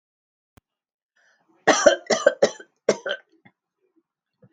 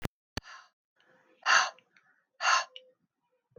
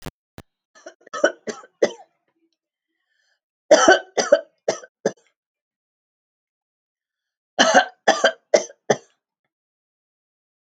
{"cough_length": "4.5 s", "cough_amplitude": 26964, "cough_signal_mean_std_ratio": 0.27, "exhalation_length": "3.6 s", "exhalation_amplitude": 10549, "exhalation_signal_mean_std_ratio": 0.3, "three_cough_length": "10.7 s", "three_cough_amplitude": 29825, "three_cough_signal_mean_std_ratio": 0.26, "survey_phase": "alpha (2021-03-01 to 2021-08-12)", "age": "65+", "gender": "Female", "wearing_mask": "No", "symptom_fever_high_temperature": true, "symptom_headache": true, "symptom_onset": "4 days", "smoker_status": "Never smoked", "respiratory_condition_asthma": false, "respiratory_condition_other": false, "recruitment_source": "Test and Trace", "submission_delay": "2 days", "covid_test_result": "Positive", "covid_test_method": "RT-qPCR", "covid_ct_value": 15.5, "covid_ct_gene": "ORF1ab gene", "covid_ct_mean": 15.9, "covid_viral_load": "6000000 copies/ml", "covid_viral_load_category": "High viral load (>1M copies/ml)"}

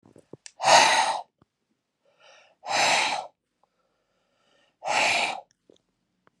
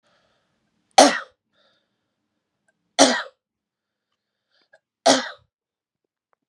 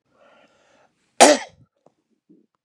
{"exhalation_length": "6.4 s", "exhalation_amplitude": 25613, "exhalation_signal_mean_std_ratio": 0.39, "three_cough_length": "6.5 s", "three_cough_amplitude": 32768, "three_cough_signal_mean_std_ratio": 0.21, "cough_length": "2.6 s", "cough_amplitude": 32767, "cough_signal_mean_std_ratio": 0.2, "survey_phase": "beta (2021-08-13 to 2022-03-07)", "age": "45-64", "gender": "Male", "wearing_mask": "No", "symptom_none": true, "symptom_onset": "5 days", "smoker_status": "Never smoked", "respiratory_condition_asthma": false, "respiratory_condition_other": false, "recruitment_source": "Test and Trace", "submission_delay": "2 days", "covid_test_result": "Positive", "covid_test_method": "RT-qPCR", "covid_ct_value": 23.0, "covid_ct_gene": "ORF1ab gene"}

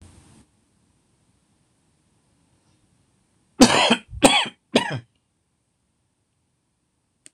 {"cough_length": "7.3 s", "cough_amplitude": 26028, "cough_signal_mean_std_ratio": 0.24, "survey_phase": "beta (2021-08-13 to 2022-03-07)", "age": "45-64", "gender": "Male", "wearing_mask": "No", "symptom_cough_any": true, "symptom_runny_or_blocked_nose": true, "symptom_headache": true, "smoker_status": "Never smoked", "respiratory_condition_asthma": false, "respiratory_condition_other": false, "recruitment_source": "Test and Trace", "submission_delay": "1 day", "covid_test_result": "Positive", "covid_test_method": "RT-qPCR"}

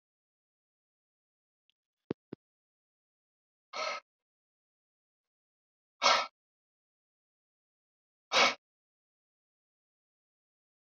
{"exhalation_length": "10.9 s", "exhalation_amplitude": 7946, "exhalation_signal_mean_std_ratio": 0.17, "survey_phase": "beta (2021-08-13 to 2022-03-07)", "age": "45-64", "gender": "Male", "wearing_mask": "No", "symptom_cough_any": true, "symptom_fatigue": true, "symptom_change_to_sense_of_smell_or_taste": true, "symptom_onset": "7 days", "smoker_status": "Ex-smoker", "respiratory_condition_asthma": false, "respiratory_condition_other": false, "recruitment_source": "Test and Trace", "submission_delay": "3 days", "covid_test_result": "Positive", "covid_test_method": "RT-qPCR", "covid_ct_value": 33.5, "covid_ct_gene": "N gene"}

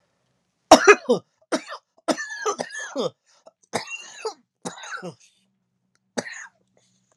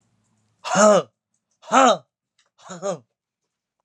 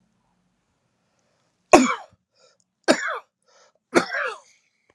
{"cough_length": "7.2 s", "cough_amplitude": 32768, "cough_signal_mean_std_ratio": 0.26, "exhalation_length": "3.8 s", "exhalation_amplitude": 29258, "exhalation_signal_mean_std_ratio": 0.33, "three_cough_length": "4.9 s", "three_cough_amplitude": 32768, "three_cough_signal_mean_std_ratio": 0.25, "survey_phase": "alpha (2021-03-01 to 2021-08-12)", "age": "18-44", "gender": "Male", "wearing_mask": "No", "symptom_shortness_of_breath": true, "symptom_fatigue": true, "symptom_onset": "3 days", "smoker_status": "Ex-smoker", "respiratory_condition_asthma": false, "respiratory_condition_other": true, "recruitment_source": "Test and Trace", "submission_delay": "2 days", "covid_test_result": "Positive", "covid_test_method": "RT-qPCR", "covid_ct_value": 16.4, "covid_ct_gene": "ORF1ab gene", "covid_ct_mean": 16.9, "covid_viral_load": "3000000 copies/ml", "covid_viral_load_category": "High viral load (>1M copies/ml)"}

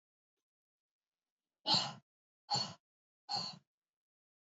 {"exhalation_length": "4.5 s", "exhalation_amplitude": 4312, "exhalation_signal_mean_std_ratio": 0.28, "survey_phase": "beta (2021-08-13 to 2022-03-07)", "age": "18-44", "gender": "Female", "wearing_mask": "No", "symptom_none": true, "smoker_status": "Never smoked", "respiratory_condition_asthma": false, "respiratory_condition_other": false, "recruitment_source": "REACT", "submission_delay": "2 days", "covid_test_result": "Negative", "covid_test_method": "RT-qPCR", "influenza_a_test_result": "Unknown/Void", "influenza_b_test_result": "Unknown/Void"}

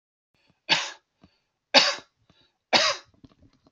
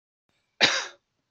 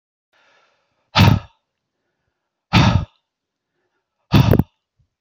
{"three_cough_length": "3.7 s", "three_cough_amplitude": 27931, "three_cough_signal_mean_std_ratio": 0.3, "cough_length": "1.3 s", "cough_amplitude": 20191, "cough_signal_mean_std_ratio": 0.31, "exhalation_length": "5.2 s", "exhalation_amplitude": 32768, "exhalation_signal_mean_std_ratio": 0.31, "survey_phase": "beta (2021-08-13 to 2022-03-07)", "age": "18-44", "gender": "Male", "wearing_mask": "No", "symptom_none": true, "smoker_status": "Never smoked", "respiratory_condition_asthma": false, "respiratory_condition_other": false, "recruitment_source": "REACT", "submission_delay": "1 day", "covid_test_result": "Negative", "covid_test_method": "RT-qPCR", "influenza_a_test_result": "Negative", "influenza_b_test_result": "Negative"}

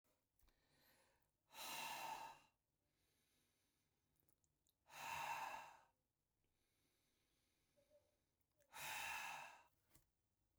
{"exhalation_length": "10.6 s", "exhalation_amplitude": 438, "exhalation_signal_mean_std_ratio": 0.42, "survey_phase": "beta (2021-08-13 to 2022-03-07)", "age": "45-64", "gender": "Male", "wearing_mask": "No", "symptom_none": true, "smoker_status": "Never smoked", "respiratory_condition_asthma": false, "respiratory_condition_other": false, "recruitment_source": "REACT", "submission_delay": "1 day", "covid_test_result": "Negative", "covid_test_method": "RT-qPCR"}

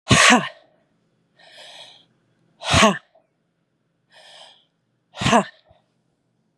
{"exhalation_length": "6.6 s", "exhalation_amplitude": 32767, "exhalation_signal_mean_std_ratio": 0.29, "survey_phase": "beta (2021-08-13 to 2022-03-07)", "age": "45-64", "gender": "Female", "wearing_mask": "No", "symptom_cough_any": true, "symptom_runny_or_blocked_nose": true, "symptom_sore_throat": true, "symptom_abdominal_pain": true, "symptom_diarrhoea": true, "symptom_fatigue": true, "symptom_headache": true, "symptom_change_to_sense_of_smell_or_taste": true, "symptom_loss_of_taste": true, "symptom_other": true, "symptom_onset": "4 days", "smoker_status": "Ex-smoker", "respiratory_condition_asthma": true, "respiratory_condition_other": false, "recruitment_source": "Test and Trace", "submission_delay": "2 days", "covid_test_result": "Positive", "covid_test_method": "RT-qPCR", "covid_ct_value": 20.9, "covid_ct_gene": "S gene"}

